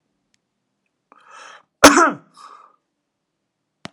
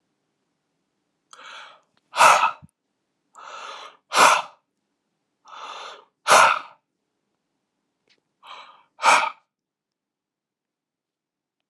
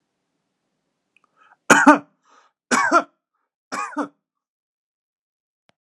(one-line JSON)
{"cough_length": "3.9 s", "cough_amplitude": 32768, "cough_signal_mean_std_ratio": 0.21, "exhalation_length": "11.7 s", "exhalation_amplitude": 29369, "exhalation_signal_mean_std_ratio": 0.27, "three_cough_length": "5.8 s", "three_cough_amplitude": 32768, "three_cough_signal_mean_std_ratio": 0.25, "survey_phase": "beta (2021-08-13 to 2022-03-07)", "age": "45-64", "gender": "Male", "wearing_mask": "No", "symptom_cough_any": true, "symptom_fatigue": true, "symptom_onset": "6 days", "smoker_status": "Never smoked", "respiratory_condition_asthma": false, "respiratory_condition_other": false, "recruitment_source": "REACT", "submission_delay": "5 days", "covid_test_result": "Negative", "covid_test_method": "RT-qPCR"}